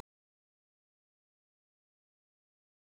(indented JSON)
{
  "three_cough_length": "2.9 s",
  "three_cough_amplitude": 1101,
  "three_cough_signal_mean_std_ratio": 0.02,
  "survey_phase": "beta (2021-08-13 to 2022-03-07)",
  "age": "45-64",
  "gender": "Female",
  "wearing_mask": "No",
  "symptom_none": true,
  "smoker_status": "Never smoked",
  "respiratory_condition_asthma": true,
  "respiratory_condition_other": false,
  "recruitment_source": "REACT",
  "submission_delay": "16 days",
  "covid_test_result": "Negative",
  "covid_test_method": "RT-qPCR",
  "influenza_a_test_result": "Negative",
  "influenza_b_test_result": "Negative"
}